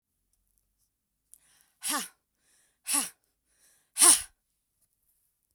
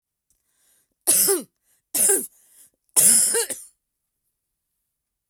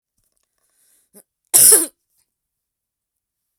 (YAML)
exhalation_length: 5.5 s
exhalation_amplitude: 22851
exhalation_signal_mean_std_ratio: 0.21
three_cough_length: 5.3 s
three_cough_amplitude: 28819
three_cough_signal_mean_std_ratio: 0.37
cough_length: 3.6 s
cough_amplitude: 32768
cough_signal_mean_std_ratio: 0.23
survey_phase: beta (2021-08-13 to 2022-03-07)
age: 45-64
gender: Female
wearing_mask: 'No'
symptom_none: true
smoker_status: Never smoked
respiratory_condition_asthma: true
respiratory_condition_other: false
recruitment_source: REACT
submission_delay: 0 days
covid_test_result: Negative
covid_test_method: RT-qPCR